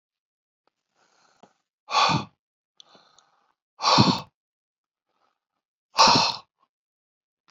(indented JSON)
{
  "exhalation_length": "7.5 s",
  "exhalation_amplitude": 23180,
  "exhalation_signal_mean_std_ratio": 0.28,
  "survey_phase": "beta (2021-08-13 to 2022-03-07)",
  "age": "65+",
  "gender": "Male",
  "wearing_mask": "No",
  "symptom_none": true,
  "smoker_status": "Never smoked",
  "respiratory_condition_asthma": false,
  "respiratory_condition_other": false,
  "recruitment_source": "REACT",
  "submission_delay": "2 days",
  "covid_test_result": "Negative",
  "covid_test_method": "RT-qPCR",
  "influenza_a_test_result": "Unknown/Void",
  "influenza_b_test_result": "Unknown/Void"
}